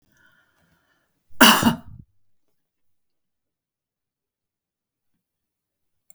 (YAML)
cough_length: 6.1 s
cough_amplitude: 32768
cough_signal_mean_std_ratio: 0.18
survey_phase: alpha (2021-03-01 to 2021-08-12)
age: 65+
gender: Female
wearing_mask: 'No'
symptom_none: true
smoker_status: Never smoked
respiratory_condition_asthma: false
respiratory_condition_other: false
recruitment_source: REACT
submission_delay: 1 day
covid_test_result: Negative
covid_test_method: RT-qPCR